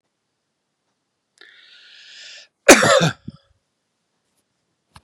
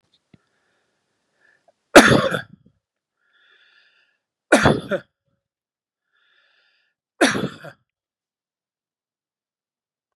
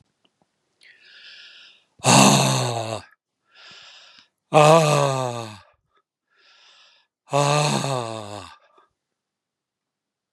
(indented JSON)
{
  "cough_length": "5.0 s",
  "cough_amplitude": 32768,
  "cough_signal_mean_std_ratio": 0.22,
  "three_cough_length": "10.2 s",
  "three_cough_amplitude": 32768,
  "three_cough_signal_mean_std_ratio": 0.21,
  "exhalation_length": "10.3 s",
  "exhalation_amplitude": 31911,
  "exhalation_signal_mean_std_ratio": 0.36,
  "survey_phase": "beta (2021-08-13 to 2022-03-07)",
  "age": "65+",
  "gender": "Male",
  "wearing_mask": "No",
  "symptom_none": true,
  "symptom_onset": "12 days",
  "smoker_status": "Never smoked",
  "respiratory_condition_asthma": false,
  "respiratory_condition_other": false,
  "recruitment_source": "REACT",
  "submission_delay": "2 days",
  "covid_test_result": "Negative",
  "covid_test_method": "RT-qPCR",
  "influenza_a_test_result": "Negative",
  "influenza_b_test_result": "Negative"
}